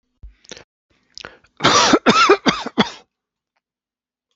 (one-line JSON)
{"cough_length": "4.4 s", "cough_amplitude": 29902, "cough_signal_mean_std_ratio": 0.37, "survey_phase": "beta (2021-08-13 to 2022-03-07)", "age": "65+", "gender": "Male", "wearing_mask": "No", "symptom_cough_any": true, "symptom_runny_or_blocked_nose": true, "symptom_fatigue": true, "symptom_change_to_sense_of_smell_or_taste": true, "symptom_other": true, "smoker_status": "Never smoked", "respiratory_condition_asthma": false, "respiratory_condition_other": false, "recruitment_source": "Test and Trace", "submission_delay": "1 day", "covid_test_result": "Positive", "covid_test_method": "RT-qPCR", "covid_ct_value": 24.8, "covid_ct_gene": "ORF1ab gene", "covid_ct_mean": 25.1, "covid_viral_load": "6000 copies/ml", "covid_viral_load_category": "Minimal viral load (< 10K copies/ml)"}